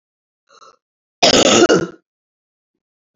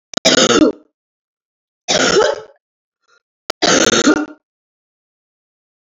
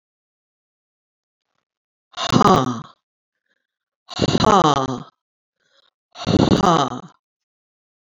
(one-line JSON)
{"cough_length": "3.2 s", "cough_amplitude": 32768, "cough_signal_mean_std_ratio": 0.35, "three_cough_length": "5.8 s", "three_cough_amplitude": 32768, "three_cough_signal_mean_std_ratio": 0.42, "exhalation_length": "8.2 s", "exhalation_amplitude": 32767, "exhalation_signal_mean_std_ratio": 0.35, "survey_phase": "beta (2021-08-13 to 2022-03-07)", "age": "65+", "gender": "Female", "wearing_mask": "No", "symptom_runny_or_blocked_nose": true, "symptom_fatigue": true, "symptom_headache": true, "smoker_status": "Never smoked", "respiratory_condition_asthma": false, "respiratory_condition_other": true, "recruitment_source": "Test and Trace", "submission_delay": "3 days", "covid_test_result": "Positive", "covid_test_method": "RT-qPCR", "covid_ct_value": 13.7, "covid_ct_gene": "ORF1ab gene"}